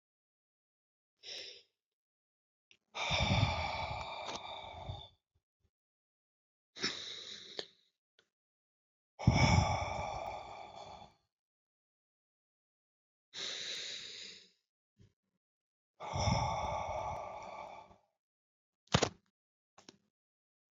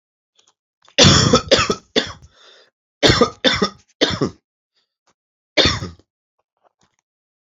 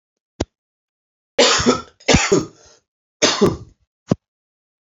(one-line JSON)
{"exhalation_length": "20.7 s", "exhalation_amplitude": 8941, "exhalation_signal_mean_std_ratio": 0.38, "cough_length": "7.4 s", "cough_amplitude": 31922, "cough_signal_mean_std_ratio": 0.36, "three_cough_length": "4.9 s", "three_cough_amplitude": 29794, "three_cough_signal_mean_std_ratio": 0.37, "survey_phase": "alpha (2021-03-01 to 2021-08-12)", "age": "45-64", "gender": "Male", "wearing_mask": "No", "symptom_cough_any": true, "symptom_new_continuous_cough": true, "symptom_fatigue": true, "symptom_fever_high_temperature": true, "symptom_change_to_sense_of_smell_or_taste": true, "symptom_loss_of_taste": true, "smoker_status": "Never smoked", "respiratory_condition_asthma": false, "respiratory_condition_other": false, "recruitment_source": "Test and Trace", "submission_delay": "2 days", "covid_test_result": "Positive", "covid_test_method": "RT-qPCR", "covid_ct_value": 17.3, "covid_ct_gene": "ORF1ab gene", "covid_ct_mean": 18.0, "covid_viral_load": "1300000 copies/ml", "covid_viral_load_category": "High viral load (>1M copies/ml)"}